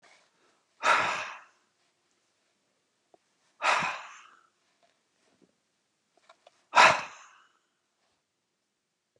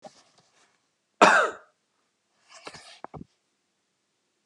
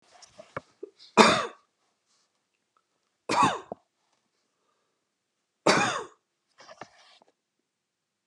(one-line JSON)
{"exhalation_length": "9.2 s", "exhalation_amplitude": 19131, "exhalation_signal_mean_std_ratio": 0.24, "cough_length": "4.5 s", "cough_amplitude": 27232, "cough_signal_mean_std_ratio": 0.21, "three_cough_length": "8.3 s", "three_cough_amplitude": 28860, "three_cough_signal_mean_std_ratio": 0.25, "survey_phase": "beta (2021-08-13 to 2022-03-07)", "age": "65+", "gender": "Male", "wearing_mask": "No", "symptom_none": true, "smoker_status": "Never smoked", "respiratory_condition_asthma": false, "respiratory_condition_other": false, "recruitment_source": "REACT", "submission_delay": "2 days", "covid_test_result": "Negative", "covid_test_method": "RT-qPCR", "influenza_a_test_result": "Unknown/Void", "influenza_b_test_result": "Unknown/Void"}